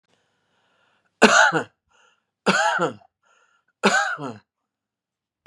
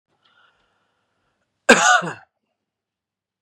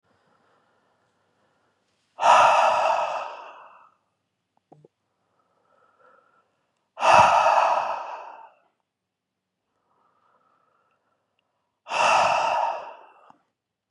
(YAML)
three_cough_length: 5.5 s
three_cough_amplitude: 32767
three_cough_signal_mean_std_ratio: 0.35
cough_length: 3.4 s
cough_amplitude: 32768
cough_signal_mean_std_ratio: 0.24
exhalation_length: 13.9 s
exhalation_amplitude: 24731
exhalation_signal_mean_std_ratio: 0.37
survey_phase: beta (2021-08-13 to 2022-03-07)
age: 18-44
gender: Male
wearing_mask: 'No'
symptom_none: true
smoker_status: Never smoked
respiratory_condition_asthma: false
respiratory_condition_other: false
recruitment_source: REACT
submission_delay: 4 days
covid_test_result: Negative
covid_test_method: RT-qPCR
influenza_a_test_result: Negative
influenza_b_test_result: Negative